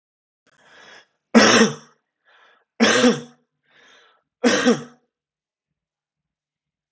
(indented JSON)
{
  "three_cough_length": "6.9 s",
  "three_cough_amplitude": 32768,
  "three_cough_signal_mean_std_ratio": 0.32,
  "survey_phase": "alpha (2021-03-01 to 2021-08-12)",
  "age": "18-44",
  "gender": "Male",
  "wearing_mask": "No",
  "symptom_none": true,
  "smoker_status": "Never smoked",
  "respiratory_condition_asthma": true,
  "respiratory_condition_other": false,
  "recruitment_source": "REACT",
  "submission_delay": "2 days",
  "covid_test_result": "Negative",
  "covid_test_method": "RT-qPCR"
}